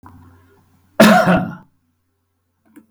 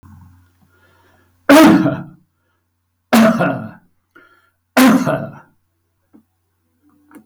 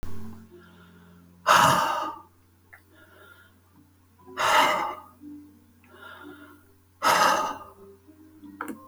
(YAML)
cough_length: 2.9 s
cough_amplitude: 32768
cough_signal_mean_std_ratio: 0.34
three_cough_length: 7.3 s
three_cough_amplitude: 32768
three_cough_signal_mean_std_ratio: 0.37
exhalation_length: 8.9 s
exhalation_amplitude: 18792
exhalation_signal_mean_std_ratio: 0.42
survey_phase: beta (2021-08-13 to 2022-03-07)
age: 65+
gender: Male
wearing_mask: 'No'
symptom_none: true
smoker_status: Never smoked
respiratory_condition_asthma: false
respiratory_condition_other: false
recruitment_source: REACT
submission_delay: 10 days
covid_test_result: Negative
covid_test_method: RT-qPCR
influenza_a_test_result: Negative
influenza_b_test_result: Negative